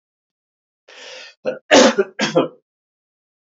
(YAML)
cough_length: 3.4 s
cough_amplitude: 29742
cough_signal_mean_std_ratio: 0.33
survey_phase: beta (2021-08-13 to 2022-03-07)
age: 45-64
gender: Male
wearing_mask: 'No'
symptom_none: true
smoker_status: Never smoked
respiratory_condition_asthma: false
respiratory_condition_other: false
recruitment_source: REACT
submission_delay: 13 days
covid_test_result: Negative
covid_test_method: RT-qPCR
influenza_a_test_result: Negative
influenza_b_test_result: Negative